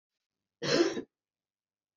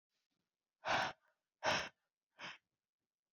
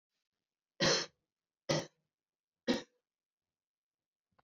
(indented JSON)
{
  "cough_length": "2.0 s",
  "cough_amplitude": 7032,
  "cough_signal_mean_std_ratio": 0.33,
  "exhalation_length": "3.3 s",
  "exhalation_amplitude": 2079,
  "exhalation_signal_mean_std_ratio": 0.33,
  "three_cough_length": "4.4 s",
  "three_cough_amplitude": 4560,
  "three_cough_signal_mean_std_ratio": 0.26,
  "survey_phase": "beta (2021-08-13 to 2022-03-07)",
  "age": "45-64",
  "gender": "Female",
  "wearing_mask": "No",
  "symptom_cough_any": true,
  "symptom_runny_or_blocked_nose": true,
  "symptom_shortness_of_breath": true,
  "symptom_sore_throat": true,
  "symptom_abdominal_pain": true,
  "symptom_headache": true,
  "symptom_change_to_sense_of_smell_or_taste": true,
  "symptom_loss_of_taste": true,
  "symptom_onset": "7 days",
  "smoker_status": "Ex-smoker",
  "respiratory_condition_asthma": false,
  "respiratory_condition_other": false,
  "recruitment_source": "Test and Trace",
  "submission_delay": "2 days",
  "covid_test_result": "Positive",
  "covid_test_method": "RT-qPCR",
  "covid_ct_value": 21.1,
  "covid_ct_gene": "ORF1ab gene"
}